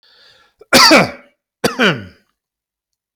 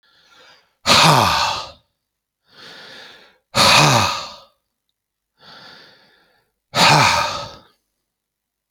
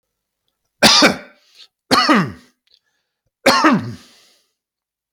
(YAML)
cough_length: 3.2 s
cough_amplitude: 32768
cough_signal_mean_std_ratio: 0.37
exhalation_length: 8.7 s
exhalation_amplitude: 32767
exhalation_signal_mean_std_ratio: 0.4
three_cough_length: 5.1 s
three_cough_amplitude: 32768
three_cough_signal_mean_std_ratio: 0.38
survey_phase: alpha (2021-03-01 to 2021-08-12)
age: 45-64
gender: Male
wearing_mask: 'No'
symptom_none: true
smoker_status: Ex-smoker
respiratory_condition_asthma: false
respiratory_condition_other: true
recruitment_source: REACT
submission_delay: 2 days
covid_test_result: Negative
covid_test_method: RT-qPCR